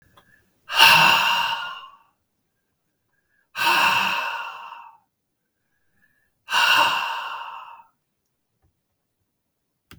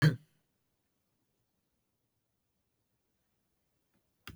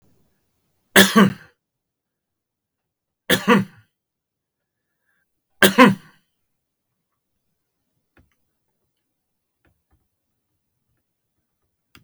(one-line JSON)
{"exhalation_length": "10.0 s", "exhalation_amplitude": 32768, "exhalation_signal_mean_std_ratio": 0.41, "cough_length": "4.4 s", "cough_amplitude": 7183, "cough_signal_mean_std_ratio": 0.14, "three_cough_length": "12.0 s", "three_cough_amplitude": 32768, "three_cough_signal_mean_std_ratio": 0.2, "survey_phase": "beta (2021-08-13 to 2022-03-07)", "age": "65+", "gender": "Male", "wearing_mask": "No", "symptom_none": true, "smoker_status": "Never smoked", "respiratory_condition_asthma": false, "respiratory_condition_other": false, "recruitment_source": "REACT", "submission_delay": "7 days", "covid_test_result": "Negative", "covid_test_method": "RT-qPCR", "influenza_a_test_result": "Negative", "influenza_b_test_result": "Negative"}